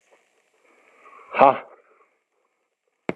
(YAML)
exhalation_length: 3.2 s
exhalation_amplitude: 32768
exhalation_signal_mean_std_ratio: 0.19
survey_phase: beta (2021-08-13 to 2022-03-07)
age: 45-64
gender: Male
wearing_mask: 'No'
symptom_none: true
symptom_onset: 12 days
smoker_status: Never smoked
respiratory_condition_asthma: false
respiratory_condition_other: false
recruitment_source: REACT
submission_delay: 3 days
covid_test_result: Negative
covid_test_method: RT-qPCR
influenza_a_test_result: Negative
influenza_b_test_result: Negative